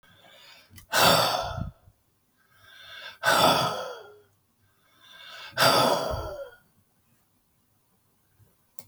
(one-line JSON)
{"exhalation_length": "8.9 s", "exhalation_amplitude": 16719, "exhalation_signal_mean_std_ratio": 0.4, "survey_phase": "beta (2021-08-13 to 2022-03-07)", "age": "65+", "gender": "Male", "wearing_mask": "No", "symptom_cough_any": true, "smoker_status": "Current smoker (11 or more cigarettes per day)", "respiratory_condition_asthma": false, "respiratory_condition_other": false, "recruitment_source": "REACT", "submission_delay": "6 days", "covid_test_result": "Negative", "covid_test_method": "RT-qPCR", "influenza_a_test_result": "Negative", "influenza_b_test_result": "Negative"}